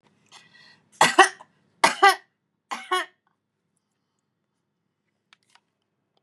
three_cough_length: 6.2 s
three_cough_amplitude: 32669
three_cough_signal_mean_std_ratio: 0.22
survey_phase: beta (2021-08-13 to 2022-03-07)
age: 45-64
gender: Female
wearing_mask: 'No'
symptom_none: true
smoker_status: Never smoked
respiratory_condition_asthma: false
respiratory_condition_other: false
recruitment_source: REACT
submission_delay: 2 days
covid_test_result: Negative
covid_test_method: RT-qPCR
influenza_a_test_result: Negative
influenza_b_test_result: Negative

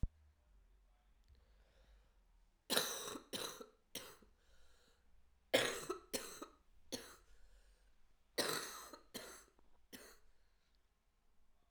cough_length: 11.7 s
cough_amplitude: 4968
cough_signal_mean_std_ratio: 0.35
survey_phase: alpha (2021-03-01 to 2021-08-12)
age: 18-44
gender: Female
wearing_mask: 'No'
symptom_cough_any: true
symptom_diarrhoea: true
symptom_fatigue: true
symptom_fever_high_temperature: true
symptom_headache: true
smoker_status: Current smoker (e-cigarettes or vapes only)
respiratory_condition_asthma: false
respiratory_condition_other: false
recruitment_source: Test and Trace
submission_delay: 1 day
covid_test_result: Positive
covid_test_method: RT-qPCR
covid_ct_value: 17.2
covid_ct_gene: ORF1ab gene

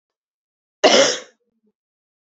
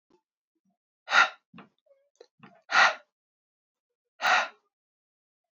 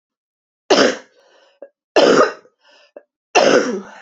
cough_length: 2.3 s
cough_amplitude: 28153
cough_signal_mean_std_ratio: 0.29
exhalation_length: 5.5 s
exhalation_amplitude: 15489
exhalation_signal_mean_std_ratio: 0.26
three_cough_length: 4.0 s
three_cough_amplitude: 29831
three_cough_signal_mean_std_ratio: 0.42
survey_phase: alpha (2021-03-01 to 2021-08-12)
age: 45-64
gender: Female
wearing_mask: 'No'
symptom_cough_any: true
symptom_fatigue: true
symptom_onset: 5 days
smoker_status: Never smoked
respiratory_condition_asthma: false
respiratory_condition_other: false
recruitment_source: Test and Trace
submission_delay: 1 day
covid_test_result: Positive
covid_test_method: RT-qPCR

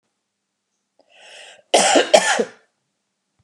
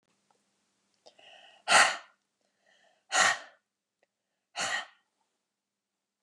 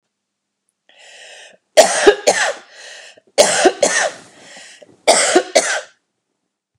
cough_length: 3.4 s
cough_amplitude: 32768
cough_signal_mean_std_ratio: 0.33
exhalation_length: 6.2 s
exhalation_amplitude: 13400
exhalation_signal_mean_std_ratio: 0.26
three_cough_length: 6.8 s
three_cough_amplitude: 32768
three_cough_signal_mean_std_ratio: 0.41
survey_phase: beta (2021-08-13 to 2022-03-07)
age: 45-64
gender: Female
wearing_mask: 'No'
symptom_none: true
smoker_status: Never smoked
respiratory_condition_asthma: false
respiratory_condition_other: false
recruitment_source: REACT
submission_delay: 6 days
covid_test_result: Negative
covid_test_method: RT-qPCR
influenza_a_test_result: Negative
influenza_b_test_result: Negative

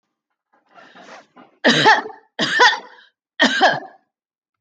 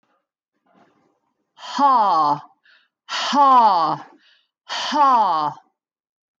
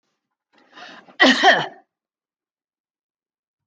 three_cough_length: 4.6 s
three_cough_amplitude: 27223
three_cough_signal_mean_std_ratio: 0.41
exhalation_length: 6.4 s
exhalation_amplitude: 18990
exhalation_signal_mean_std_ratio: 0.51
cough_length: 3.7 s
cough_amplitude: 25880
cough_signal_mean_std_ratio: 0.27
survey_phase: beta (2021-08-13 to 2022-03-07)
age: 45-64
gender: Female
wearing_mask: 'No'
symptom_none: true
smoker_status: Never smoked
respiratory_condition_asthma: false
respiratory_condition_other: false
recruitment_source: REACT
submission_delay: 3 days
covid_test_result: Negative
covid_test_method: RT-qPCR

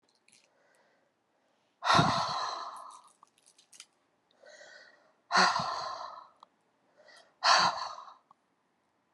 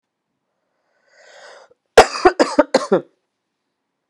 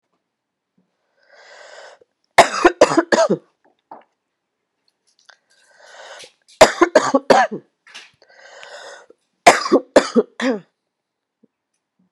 exhalation_length: 9.1 s
exhalation_amplitude: 9861
exhalation_signal_mean_std_ratio: 0.35
cough_length: 4.1 s
cough_amplitude: 32768
cough_signal_mean_std_ratio: 0.25
three_cough_length: 12.1 s
three_cough_amplitude: 32768
three_cough_signal_mean_std_ratio: 0.28
survey_phase: beta (2021-08-13 to 2022-03-07)
age: 18-44
gender: Female
wearing_mask: 'No'
symptom_cough_any: true
symptom_runny_or_blocked_nose: true
symptom_headache: true
symptom_onset: 4 days
smoker_status: Never smoked
respiratory_condition_asthma: true
respiratory_condition_other: false
recruitment_source: Test and Trace
submission_delay: 2 days
covid_test_result: Positive
covid_test_method: RT-qPCR
covid_ct_value: 28.3
covid_ct_gene: ORF1ab gene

